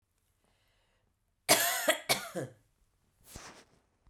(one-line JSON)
{"cough_length": "4.1 s", "cough_amplitude": 13602, "cough_signal_mean_std_ratio": 0.32, "survey_phase": "beta (2021-08-13 to 2022-03-07)", "age": "45-64", "gender": "Female", "wearing_mask": "No", "symptom_fatigue": true, "smoker_status": "Never smoked", "respiratory_condition_asthma": true, "respiratory_condition_other": false, "recruitment_source": "REACT", "submission_delay": "3 days", "covid_test_result": "Negative", "covid_test_method": "RT-qPCR"}